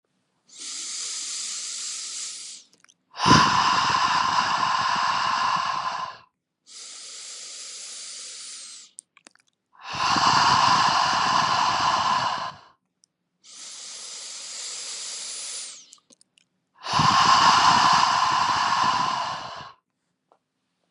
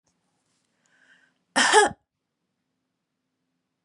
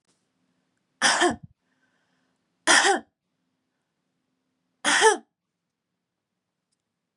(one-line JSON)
{"exhalation_length": "20.9 s", "exhalation_amplitude": 24649, "exhalation_signal_mean_std_ratio": 0.62, "cough_length": "3.8 s", "cough_amplitude": 25055, "cough_signal_mean_std_ratio": 0.23, "three_cough_length": "7.2 s", "three_cough_amplitude": 21433, "three_cough_signal_mean_std_ratio": 0.28, "survey_phase": "beta (2021-08-13 to 2022-03-07)", "age": "18-44", "gender": "Female", "wearing_mask": "No", "symptom_sore_throat": true, "symptom_headache": true, "symptom_onset": "4 days", "smoker_status": "Never smoked", "respiratory_condition_asthma": false, "respiratory_condition_other": false, "recruitment_source": "Test and Trace", "submission_delay": "2 days", "covid_test_result": "Positive", "covid_test_method": "RT-qPCR", "covid_ct_value": 33.0, "covid_ct_gene": "N gene"}